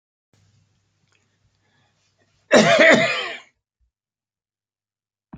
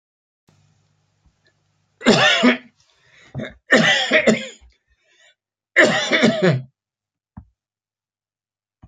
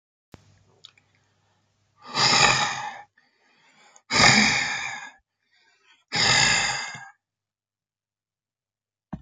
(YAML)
cough_length: 5.4 s
cough_amplitude: 30281
cough_signal_mean_std_ratio: 0.29
three_cough_length: 8.9 s
three_cough_amplitude: 28889
three_cough_signal_mean_std_ratio: 0.39
exhalation_length: 9.2 s
exhalation_amplitude: 27271
exhalation_signal_mean_std_ratio: 0.39
survey_phase: beta (2021-08-13 to 2022-03-07)
age: 65+
gender: Male
wearing_mask: 'No'
symptom_cough_any: true
symptom_runny_or_blocked_nose: true
symptom_sore_throat: true
symptom_onset: 12 days
smoker_status: Never smoked
respiratory_condition_asthma: false
respiratory_condition_other: false
recruitment_source: REACT
submission_delay: 4 days
covid_test_result: Negative
covid_test_method: RT-qPCR
influenza_a_test_result: Unknown/Void
influenza_b_test_result: Unknown/Void